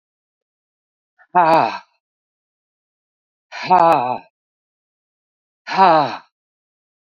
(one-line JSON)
{"exhalation_length": "7.2 s", "exhalation_amplitude": 28052, "exhalation_signal_mean_std_ratio": 0.33, "survey_phase": "beta (2021-08-13 to 2022-03-07)", "age": "65+", "gender": "Female", "wearing_mask": "No", "symptom_runny_or_blocked_nose": true, "symptom_sore_throat": true, "symptom_headache": true, "smoker_status": "Ex-smoker", "respiratory_condition_asthma": false, "respiratory_condition_other": false, "recruitment_source": "Test and Trace", "submission_delay": "1 day", "covid_test_result": "Positive", "covid_test_method": "LFT"}